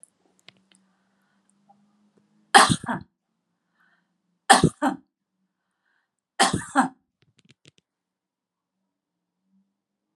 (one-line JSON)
{"three_cough_length": "10.2 s", "three_cough_amplitude": 32038, "three_cough_signal_mean_std_ratio": 0.21, "survey_phase": "beta (2021-08-13 to 2022-03-07)", "age": "65+", "gender": "Female", "wearing_mask": "No", "symptom_none": true, "smoker_status": "Never smoked", "respiratory_condition_asthma": false, "respiratory_condition_other": false, "recruitment_source": "REACT", "submission_delay": "2 days", "covid_test_result": "Negative", "covid_test_method": "RT-qPCR"}